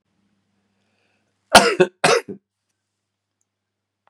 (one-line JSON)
{"cough_length": "4.1 s", "cough_amplitude": 32768, "cough_signal_mean_std_ratio": 0.24, "survey_phase": "beta (2021-08-13 to 2022-03-07)", "age": "45-64", "gender": "Male", "wearing_mask": "No", "symptom_cough_any": true, "symptom_new_continuous_cough": true, "symptom_runny_or_blocked_nose": true, "symptom_shortness_of_breath": true, "symptom_sore_throat": true, "symptom_abdominal_pain": true, "symptom_fatigue": true, "symptom_onset": "2 days", "smoker_status": "Ex-smoker", "respiratory_condition_asthma": false, "respiratory_condition_other": false, "recruitment_source": "Test and Trace", "submission_delay": "2 days", "covid_test_result": "Positive", "covid_test_method": "RT-qPCR", "covid_ct_value": 20.1, "covid_ct_gene": "ORF1ab gene", "covid_ct_mean": 20.2, "covid_viral_load": "240000 copies/ml", "covid_viral_load_category": "Low viral load (10K-1M copies/ml)"}